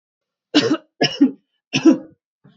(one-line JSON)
{"three_cough_length": "2.6 s", "three_cough_amplitude": 28985, "three_cough_signal_mean_std_ratio": 0.38, "survey_phase": "beta (2021-08-13 to 2022-03-07)", "age": "18-44", "gender": "Male", "wearing_mask": "No", "symptom_none": true, "smoker_status": "Never smoked", "respiratory_condition_asthma": false, "respiratory_condition_other": false, "recruitment_source": "REACT", "submission_delay": "4 days", "covid_test_result": "Negative", "covid_test_method": "RT-qPCR", "influenza_a_test_result": "Negative", "influenza_b_test_result": "Negative"}